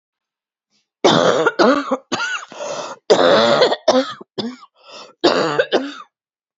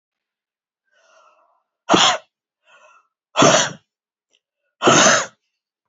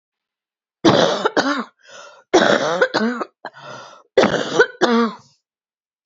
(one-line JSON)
{"cough_length": "6.6 s", "cough_amplitude": 32767, "cough_signal_mean_std_ratio": 0.53, "exhalation_length": "5.9 s", "exhalation_amplitude": 30117, "exhalation_signal_mean_std_ratio": 0.33, "three_cough_length": "6.1 s", "three_cough_amplitude": 28895, "three_cough_signal_mean_std_ratio": 0.48, "survey_phase": "beta (2021-08-13 to 2022-03-07)", "age": "45-64", "gender": "Female", "wearing_mask": "No", "symptom_cough_any": true, "symptom_fatigue": true, "symptom_headache": true, "symptom_change_to_sense_of_smell_or_taste": true, "symptom_onset": "12 days", "smoker_status": "Never smoked", "respiratory_condition_asthma": false, "respiratory_condition_other": false, "recruitment_source": "REACT", "submission_delay": "2 days", "covid_test_result": "Negative", "covid_test_method": "RT-qPCR", "covid_ct_value": 38.0, "covid_ct_gene": "N gene"}